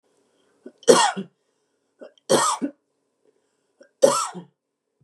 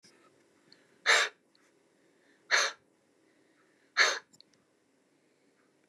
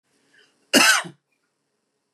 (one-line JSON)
{"three_cough_length": "5.0 s", "three_cough_amplitude": 32328, "three_cough_signal_mean_std_ratio": 0.31, "exhalation_length": "5.9 s", "exhalation_amplitude": 10275, "exhalation_signal_mean_std_ratio": 0.26, "cough_length": "2.1 s", "cough_amplitude": 27780, "cough_signal_mean_std_ratio": 0.3, "survey_phase": "beta (2021-08-13 to 2022-03-07)", "age": "45-64", "gender": "Female", "wearing_mask": "No", "symptom_none": true, "symptom_onset": "12 days", "smoker_status": "Ex-smoker", "respiratory_condition_asthma": false, "respiratory_condition_other": false, "recruitment_source": "REACT", "submission_delay": "5 days", "covid_test_result": "Negative", "covid_test_method": "RT-qPCR", "influenza_a_test_result": "Negative", "influenza_b_test_result": "Negative"}